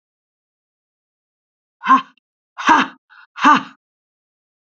{"exhalation_length": "4.8 s", "exhalation_amplitude": 30954, "exhalation_signal_mean_std_ratio": 0.28, "survey_phase": "beta (2021-08-13 to 2022-03-07)", "age": "45-64", "gender": "Female", "wearing_mask": "No", "symptom_sore_throat": true, "symptom_fatigue": true, "symptom_headache": true, "symptom_onset": "3 days", "smoker_status": "Never smoked", "respiratory_condition_asthma": false, "respiratory_condition_other": false, "recruitment_source": "Test and Trace", "submission_delay": "1 day", "covid_test_result": "Positive", "covid_test_method": "RT-qPCR", "covid_ct_value": 22.4, "covid_ct_gene": "ORF1ab gene", "covid_ct_mean": 23.5, "covid_viral_load": "19000 copies/ml", "covid_viral_load_category": "Low viral load (10K-1M copies/ml)"}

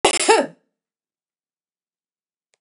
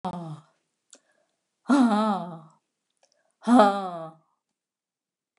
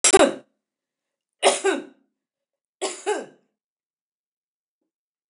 {"cough_length": "2.6 s", "cough_amplitude": 29947, "cough_signal_mean_std_ratio": 0.28, "exhalation_length": "5.4 s", "exhalation_amplitude": 23715, "exhalation_signal_mean_std_ratio": 0.36, "three_cough_length": "5.3 s", "three_cough_amplitude": 29667, "three_cough_signal_mean_std_ratio": 0.28, "survey_phase": "beta (2021-08-13 to 2022-03-07)", "age": "65+", "gender": "Female", "wearing_mask": "No", "symptom_other": true, "smoker_status": "Never smoked", "respiratory_condition_asthma": false, "respiratory_condition_other": false, "recruitment_source": "REACT", "submission_delay": "1 day", "covid_test_result": "Negative", "covid_test_method": "RT-qPCR", "influenza_a_test_result": "Negative", "influenza_b_test_result": "Negative"}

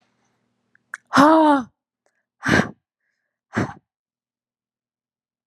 {"exhalation_length": "5.5 s", "exhalation_amplitude": 31010, "exhalation_signal_mean_std_ratio": 0.31, "survey_phase": "beta (2021-08-13 to 2022-03-07)", "age": "18-44", "gender": "Female", "wearing_mask": "No", "symptom_none": true, "smoker_status": "Ex-smoker", "respiratory_condition_asthma": false, "respiratory_condition_other": false, "recruitment_source": "REACT", "submission_delay": "0 days", "covid_test_result": "Negative", "covid_test_method": "RT-qPCR"}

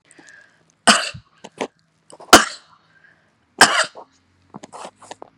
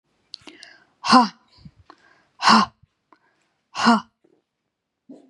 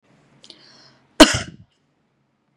{"three_cough_length": "5.4 s", "three_cough_amplitude": 32768, "three_cough_signal_mean_std_ratio": 0.24, "exhalation_length": "5.3 s", "exhalation_amplitude": 30282, "exhalation_signal_mean_std_ratio": 0.28, "cough_length": "2.6 s", "cough_amplitude": 32768, "cough_signal_mean_std_ratio": 0.18, "survey_phase": "beta (2021-08-13 to 2022-03-07)", "age": "45-64", "gender": "Female", "wearing_mask": "No", "symptom_none": true, "smoker_status": "Ex-smoker", "respiratory_condition_asthma": false, "respiratory_condition_other": false, "recruitment_source": "REACT", "submission_delay": "1 day", "covid_test_result": "Negative", "covid_test_method": "RT-qPCR", "influenza_a_test_result": "Negative", "influenza_b_test_result": "Negative"}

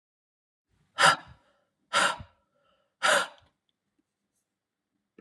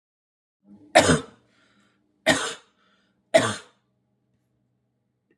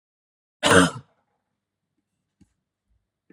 {"exhalation_length": "5.2 s", "exhalation_amplitude": 17669, "exhalation_signal_mean_std_ratio": 0.27, "three_cough_length": "5.4 s", "three_cough_amplitude": 28350, "three_cough_signal_mean_std_ratio": 0.26, "cough_length": "3.3 s", "cough_amplitude": 29743, "cough_signal_mean_std_ratio": 0.22, "survey_phase": "alpha (2021-03-01 to 2021-08-12)", "age": "45-64", "gender": "Female", "wearing_mask": "No", "symptom_cough_any": true, "symptom_diarrhoea": true, "symptom_fatigue": true, "symptom_headache": true, "symptom_change_to_sense_of_smell_or_taste": true, "symptom_onset": "4 days", "smoker_status": "Never smoked", "respiratory_condition_asthma": false, "respiratory_condition_other": false, "recruitment_source": "Test and Trace", "submission_delay": "2 days", "covid_test_result": "Positive", "covid_test_method": "RT-qPCR", "covid_ct_value": 16.0, "covid_ct_gene": "ORF1ab gene"}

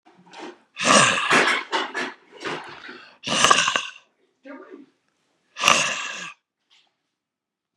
{"exhalation_length": "7.8 s", "exhalation_amplitude": 32768, "exhalation_signal_mean_std_ratio": 0.43, "survey_phase": "beta (2021-08-13 to 2022-03-07)", "age": "65+", "gender": "Male", "wearing_mask": "No", "symptom_cough_any": true, "symptom_runny_or_blocked_nose": true, "symptom_headache": true, "symptom_onset": "4 days", "smoker_status": "Never smoked", "respiratory_condition_asthma": false, "respiratory_condition_other": false, "recruitment_source": "Test and Trace", "submission_delay": "2 days", "covid_test_result": "Negative", "covid_test_method": "RT-qPCR"}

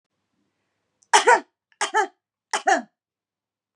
{"three_cough_length": "3.8 s", "three_cough_amplitude": 27517, "three_cough_signal_mean_std_ratio": 0.3, "survey_phase": "beta (2021-08-13 to 2022-03-07)", "age": "45-64", "gender": "Female", "wearing_mask": "No", "symptom_none": true, "smoker_status": "Never smoked", "respiratory_condition_asthma": false, "respiratory_condition_other": false, "recruitment_source": "REACT", "submission_delay": "2 days", "covid_test_result": "Negative", "covid_test_method": "RT-qPCR", "influenza_a_test_result": "Negative", "influenza_b_test_result": "Negative"}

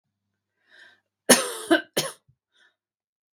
{"cough_length": "3.3 s", "cough_amplitude": 32535, "cough_signal_mean_std_ratio": 0.25, "survey_phase": "beta (2021-08-13 to 2022-03-07)", "age": "45-64", "gender": "Female", "wearing_mask": "No", "symptom_none": true, "smoker_status": "Ex-smoker", "respiratory_condition_asthma": false, "respiratory_condition_other": false, "recruitment_source": "REACT", "submission_delay": "2 days", "covid_test_result": "Negative", "covid_test_method": "RT-qPCR", "influenza_a_test_result": "Unknown/Void", "influenza_b_test_result": "Unknown/Void"}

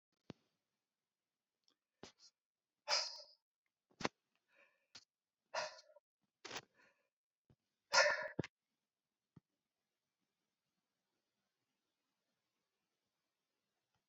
{"exhalation_length": "14.1 s", "exhalation_amplitude": 4410, "exhalation_signal_mean_std_ratio": 0.18, "survey_phase": "beta (2021-08-13 to 2022-03-07)", "age": "45-64", "gender": "Male", "wearing_mask": "No", "symptom_none": true, "smoker_status": "Never smoked", "respiratory_condition_asthma": false, "respiratory_condition_other": false, "recruitment_source": "REACT", "submission_delay": "1 day", "covid_test_result": "Negative", "covid_test_method": "RT-qPCR"}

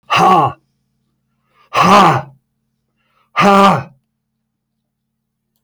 {"exhalation_length": "5.6 s", "exhalation_amplitude": 32768, "exhalation_signal_mean_std_ratio": 0.42, "survey_phase": "alpha (2021-03-01 to 2021-08-12)", "age": "45-64", "gender": "Male", "wearing_mask": "No", "symptom_cough_any": true, "smoker_status": "Ex-smoker", "respiratory_condition_asthma": false, "respiratory_condition_other": false, "recruitment_source": "REACT", "submission_delay": "1 day", "covid_test_result": "Negative", "covid_test_method": "RT-qPCR"}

